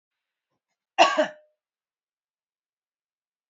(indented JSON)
{
  "cough_length": "3.5 s",
  "cough_amplitude": 22773,
  "cough_signal_mean_std_ratio": 0.2,
  "survey_phase": "beta (2021-08-13 to 2022-03-07)",
  "age": "45-64",
  "gender": "Female",
  "wearing_mask": "No",
  "symptom_cough_any": true,
  "symptom_runny_or_blocked_nose": true,
  "symptom_fatigue": true,
  "symptom_headache": true,
  "symptom_other": true,
  "symptom_onset": "3 days",
  "smoker_status": "Ex-smoker",
  "respiratory_condition_asthma": false,
  "respiratory_condition_other": false,
  "recruitment_source": "Test and Trace",
  "submission_delay": "1 day",
  "covid_test_result": "Positive",
  "covid_test_method": "RT-qPCR",
  "covid_ct_value": 20.7,
  "covid_ct_gene": "N gene"
}